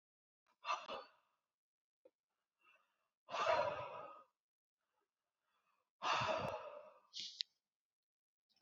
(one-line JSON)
{"exhalation_length": "8.6 s", "exhalation_amplitude": 3709, "exhalation_signal_mean_std_ratio": 0.36, "survey_phase": "alpha (2021-03-01 to 2021-08-12)", "age": "18-44", "gender": "Male", "wearing_mask": "No", "symptom_none": true, "smoker_status": "Never smoked", "respiratory_condition_asthma": false, "respiratory_condition_other": false, "recruitment_source": "REACT", "submission_delay": "5 days", "covid_test_result": "Negative", "covid_test_method": "RT-qPCR"}